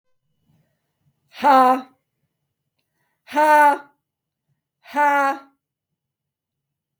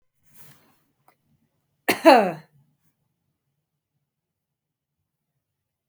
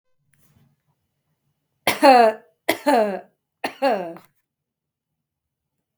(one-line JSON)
{"exhalation_length": "7.0 s", "exhalation_amplitude": 23413, "exhalation_signal_mean_std_ratio": 0.34, "cough_length": "5.9 s", "cough_amplitude": 28317, "cough_signal_mean_std_ratio": 0.18, "three_cough_length": "6.0 s", "three_cough_amplitude": 32768, "three_cough_signal_mean_std_ratio": 0.32, "survey_phase": "beta (2021-08-13 to 2022-03-07)", "age": "45-64", "gender": "Female", "wearing_mask": "Yes", "symptom_none": true, "smoker_status": "Never smoked", "respiratory_condition_asthma": false, "respiratory_condition_other": false, "recruitment_source": "Test and Trace", "submission_delay": "2 days", "covid_test_result": "Positive", "covid_test_method": "ePCR"}